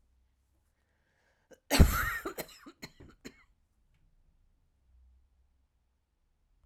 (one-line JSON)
{"cough_length": "6.7 s", "cough_amplitude": 18958, "cough_signal_mean_std_ratio": 0.2, "survey_phase": "alpha (2021-03-01 to 2021-08-12)", "age": "45-64", "gender": "Female", "wearing_mask": "No", "symptom_cough_any": true, "symptom_fatigue": true, "symptom_headache": true, "symptom_change_to_sense_of_smell_or_taste": true, "symptom_onset": "7 days", "smoker_status": "Never smoked", "respiratory_condition_asthma": false, "respiratory_condition_other": false, "recruitment_source": "Test and Trace", "submission_delay": "2 days", "covid_test_result": "Positive", "covid_test_method": "RT-qPCR", "covid_ct_value": 19.3, "covid_ct_gene": "ORF1ab gene", "covid_ct_mean": 20.2, "covid_viral_load": "240000 copies/ml", "covid_viral_load_category": "Low viral load (10K-1M copies/ml)"}